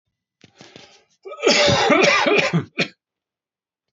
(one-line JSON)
{"cough_length": "3.9 s", "cough_amplitude": 24877, "cough_signal_mean_std_ratio": 0.5, "survey_phase": "beta (2021-08-13 to 2022-03-07)", "age": "45-64", "gender": "Male", "wearing_mask": "No", "symptom_cough_any": true, "symptom_new_continuous_cough": true, "symptom_runny_or_blocked_nose": true, "symptom_fatigue": true, "symptom_headache": true, "symptom_other": true, "smoker_status": "Never smoked", "respiratory_condition_asthma": false, "respiratory_condition_other": false, "recruitment_source": "Test and Trace", "submission_delay": "1 day", "covid_test_result": "Positive", "covid_test_method": "RT-qPCR"}